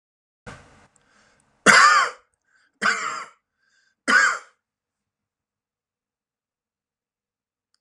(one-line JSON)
{"three_cough_length": "7.8 s", "three_cough_amplitude": 32410, "three_cough_signal_mean_std_ratio": 0.27, "survey_phase": "alpha (2021-03-01 to 2021-08-12)", "age": "45-64", "gender": "Male", "wearing_mask": "No", "symptom_cough_any": true, "symptom_onset": "8 days", "smoker_status": "Never smoked", "respiratory_condition_asthma": true, "respiratory_condition_other": false, "recruitment_source": "REACT", "submission_delay": "2 days", "covid_test_result": "Negative", "covid_test_method": "RT-qPCR"}